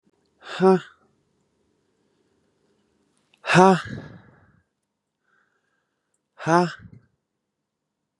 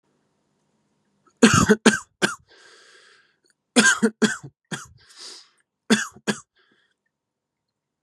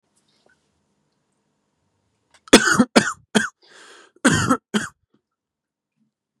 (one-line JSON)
{"exhalation_length": "8.2 s", "exhalation_amplitude": 31552, "exhalation_signal_mean_std_ratio": 0.23, "three_cough_length": "8.0 s", "three_cough_amplitude": 32583, "three_cough_signal_mean_std_ratio": 0.29, "cough_length": "6.4 s", "cough_amplitude": 32768, "cough_signal_mean_std_ratio": 0.27, "survey_phase": "beta (2021-08-13 to 2022-03-07)", "age": "18-44", "gender": "Male", "wearing_mask": "No", "symptom_none": true, "smoker_status": "Never smoked", "respiratory_condition_asthma": false, "respiratory_condition_other": false, "recruitment_source": "REACT", "submission_delay": "2 days", "covid_test_result": "Negative", "covid_test_method": "RT-qPCR"}